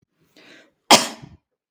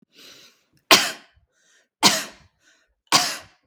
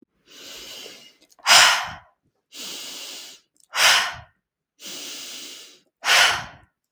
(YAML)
cough_length: 1.7 s
cough_amplitude: 32768
cough_signal_mean_std_ratio: 0.22
three_cough_length: 3.7 s
three_cough_amplitude: 32768
three_cough_signal_mean_std_ratio: 0.29
exhalation_length: 6.9 s
exhalation_amplitude: 32768
exhalation_signal_mean_std_ratio: 0.37
survey_phase: beta (2021-08-13 to 2022-03-07)
age: 18-44
gender: Female
wearing_mask: 'No'
symptom_none: true
smoker_status: Never smoked
respiratory_condition_asthma: false
respiratory_condition_other: false
recruitment_source: REACT
submission_delay: 1 day
covid_test_result: Negative
covid_test_method: RT-qPCR
influenza_a_test_result: Negative
influenza_b_test_result: Negative